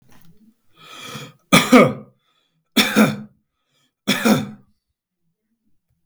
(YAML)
three_cough_length: 6.1 s
three_cough_amplitude: 32768
three_cough_signal_mean_std_ratio: 0.33
survey_phase: alpha (2021-03-01 to 2021-08-12)
age: 65+
gender: Male
wearing_mask: 'No'
symptom_none: true
smoker_status: Ex-smoker
respiratory_condition_asthma: false
respiratory_condition_other: false
recruitment_source: REACT
submission_delay: 2 days
covid_test_result: Negative
covid_test_method: RT-qPCR